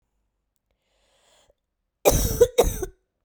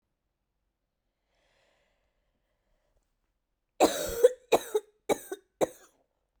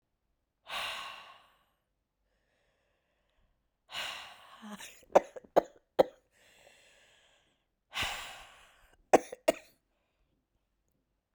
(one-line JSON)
{"cough_length": "3.2 s", "cough_amplitude": 23904, "cough_signal_mean_std_ratio": 0.32, "three_cough_length": "6.4 s", "three_cough_amplitude": 13371, "three_cough_signal_mean_std_ratio": 0.23, "exhalation_length": "11.3 s", "exhalation_amplitude": 12632, "exhalation_signal_mean_std_ratio": 0.19, "survey_phase": "beta (2021-08-13 to 2022-03-07)", "age": "45-64", "gender": "Female", "wearing_mask": "No", "symptom_cough_any": true, "symptom_new_continuous_cough": true, "symptom_runny_or_blocked_nose": true, "symptom_sore_throat": true, "symptom_other": true, "smoker_status": "Never smoked", "respiratory_condition_asthma": false, "respiratory_condition_other": false, "recruitment_source": "Test and Trace", "submission_delay": "1 day", "covid_test_result": "Positive", "covid_test_method": "RT-qPCR", "covid_ct_value": 17.9, "covid_ct_gene": "ORF1ab gene", "covid_ct_mean": 18.4, "covid_viral_load": "950000 copies/ml", "covid_viral_load_category": "Low viral load (10K-1M copies/ml)"}